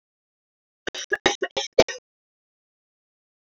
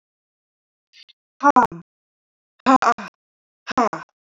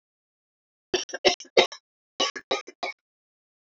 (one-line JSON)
{"cough_length": "3.4 s", "cough_amplitude": 28264, "cough_signal_mean_std_ratio": 0.21, "exhalation_length": "4.4 s", "exhalation_amplitude": 26330, "exhalation_signal_mean_std_ratio": 0.28, "three_cough_length": "3.8 s", "three_cough_amplitude": 24451, "three_cough_signal_mean_std_ratio": 0.27, "survey_phase": "beta (2021-08-13 to 2022-03-07)", "age": "45-64", "gender": "Female", "wearing_mask": "No", "symptom_none": true, "smoker_status": "Never smoked", "respiratory_condition_asthma": true, "respiratory_condition_other": false, "recruitment_source": "REACT", "submission_delay": "1 day", "covid_test_result": "Negative", "covid_test_method": "RT-qPCR"}